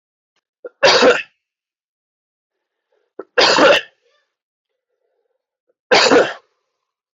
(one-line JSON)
{"three_cough_length": "7.2 s", "three_cough_amplitude": 31992, "three_cough_signal_mean_std_ratio": 0.34, "survey_phase": "beta (2021-08-13 to 2022-03-07)", "age": "18-44", "gender": "Male", "wearing_mask": "No", "symptom_sore_throat": true, "symptom_onset": "2 days", "smoker_status": "Never smoked", "respiratory_condition_asthma": false, "respiratory_condition_other": false, "recruitment_source": "REACT", "submission_delay": "1 day", "covid_test_result": "Negative", "covid_test_method": "RT-qPCR"}